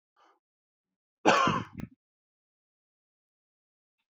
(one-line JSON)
{"cough_length": "4.1 s", "cough_amplitude": 16412, "cough_signal_mean_std_ratio": 0.24, "survey_phase": "beta (2021-08-13 to 2022-03-07)", "age": "45-64", "gender": "Male", "wearing_mask": "No", "symptom_cough_any": true, "symptom_shortness_of_breath": true, "symptom_fatigue": true, "symptom_change_to_sense_of_smell_or_taste": true, "smoker_status": "Never smoked", "respiratory_condition_asthma": false, "respiratory_condition_other": false, "recruitment_source": "Test and Trace", "submission_delay": "2 days", "covid_test_result": "Positive", "covid_test_method": "RT-qPCR", "covid_ct_value": 20.4, "covid_ct_gene": "ORF1ab gene"}